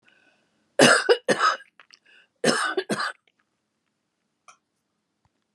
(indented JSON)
{
  "cough_length": "5.5 s",
  "cough_amplitude": 32289,
  "cough_signal_mean_std_ratio": 0.33,
  "survey_phase": "beta (2021-08-13 to 2022-03-07)",
  "age": "65+",
  "gender": "Female",
  "wearing_mask": "No",
  "symptom_cough_any": true,
  "symptom_runny_or_blocked_nose": true,
  "symptom_shortness_of_breath": true,
  "symptom_sore_throat": true,
  "symptom_diarrhoea": true,
  "smoker_status": "Ex-smoker",
  "respiratory_condition_asthma": true,
  "respiratory_condition_other": false,
  "recruitment_source": "Test and Trace",
  "submission_delay": "3 days",
  "covid_test_result": "Positive",
  "covid_test_method": "RT-qPCR",
  "covid_ct_value": 17.2,
  "covid_ct_gene": "N gene",
  "covid_ct_mean": 17.4,
  "covid_viral_load": "2000000 copies/ml",
  "covid_viral_load_category": "High viral load (>1M copies/ml)"
}